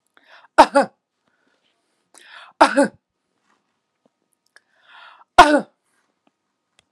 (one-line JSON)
{"three_cough_length": "6.9 s", "three_cough_amplitude": 32768, "three_cough_signal_mean_std_ratio": 0.21, "survey_phase": "alpha (2021-03-01 to 2021-08-12)", "age": "45-64", "gender": "Female", "wearing_mask": "No", "symptom_none": true, "smoker_status": "Ex-smoker", "respiratory_condition_asthma": true, "respiratory_condition_other": false, "recruitment_source": "Test and Trace", "submission_delay": "2 days", "covid_test_result": "Positive", "covid_test_method": "LAMP"}